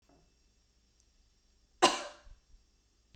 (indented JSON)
{
  "cough_length": "3.2 s",
  "cough_amplitude": 12071,
  "cough_signal_mean_std_ratio": 0.19,
  "survey_phase": "beta (2021-08-13 to 2022-03-07)",
  "age": "45-64",
  "gender": "Female",
  "wearing_mask": "No",
  "symptom_none": true,
  "smoker_status": "Never smoked",
  "respiratory_condition_asthma": false,
  "respiratory_condition_other": false,
  "recruitment_source": "REACT",
  "submission_delay": "-1 day",
  "covid_test_result": "Negative",
  "covid_test_method": "RT-qPCR"
}